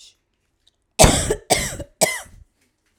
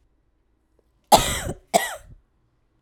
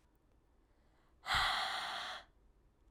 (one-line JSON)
{"three_cough_length": "3.0 s", "three_cough_amplitude": 32768, "three_cough_signal_mean_std_ratio": 0.35, "cough_length": "2.8 s", "cough_amplitude": 32369, "cough_signal_mean_std_ratio": 0.28, "exhalation_length": "2.9 s", "exhalation_amplitude": 2968, "exhalation_signal_mean_std_ratio": 0.47, "survey_phase": "alpha (2021-03-01 to 2021-08-12)", "age": "18-44", "gender": "Female", "wearing_mask": "No", "symptom_cough_any": true, "symptom_new_continuous_cough": true, "symptom_change_to_sense_of_smell_or_taste": true, "symptom_loss_of_taste": true, "symptom_onset": "10 days", "smoker_status": "Never smoked", "respiratory_condition_asthma": false, "respiratory_condition_other": false, "recruitment_source": "Test and Trace", "submission_delay": "2 days", "covid_test_result": "Positive", "covid_test_method": "RT-qPCR"}